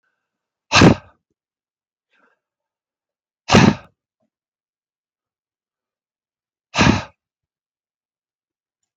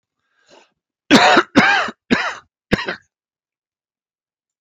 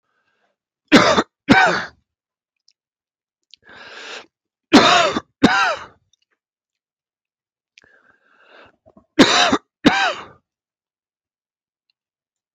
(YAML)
exhalation_length: 9.0 s
exhalation_amplitude: 32512
exhalation_signal_mean_std_ratio: 0.21
cough_length: 4.6 s
cough_amplitude: 32320
cough_signal_mean_std_ratio: 0.36
three_cough_length: 12.5 s
three_cough_amplitude: 32768
three_cough_signal_mean_std_ratio: 0.32
survey_phase: alpha (2021-03-01 to 2021-08-12)
age: 65+
gender: Male
wearing_mask: 'No'
symptom_none: true
smoker_status: Never smoked
respiratory_condition_asthma: true
respiratory_condition_other: false
recruitment_source: REACT
submission_delay: 1 day
covid_test_result: Negative
covid_test_method: RT-qPCR